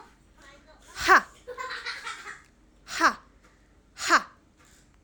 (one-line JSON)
{"exhalation_length": "5.0 s", "exhalation_amplitude": 18036, "exhalation_signal_mean_std_ratio": 0.31, "survey_phase": "alpha (2021-03-01 to 2021-08-12)", "age": "18-44", "gender": "Female", "wearing_mask": "No", "symptom_none": true, "smoker_status": "Never smoked", "respiratory_condition_asthma": false, "respiratory_condition_other": false, "recruitment_source": "REACT", "submission_delay": "5 days", "covid_test_result": "Negative", "covid_test_method": "RT-qPCR"}